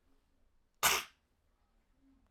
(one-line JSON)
{"cough_length": "2.3 s", "cough_amplitude": 7135, "cough_signal_mean_std_ratio": 0.24, "survey_phase": "alpha (2021-03-01 to 2021-08-12)", "age": "45-64", "gender": "Female", "wearing_mask": "No", "symptom_fatigue": true, "smoker_status": "Never smoked", "respiratory_condition_asthma": false, "respiratory_condition_other": false, "recruitment_source": "Test and Trace", "submission_delay": "2 days", "covid_test_result": "Positive", "covid_test_method": "RT-qPCR", "covid_ct_value": 19.9, "covid_ct_gene": "ORF1ab gene", "covid_ct_mean": 20.8, "covid_viral_load": "150000 copies/ml", "covid_viral_load_category": "Low viral load (10K-1M copies/ml)"}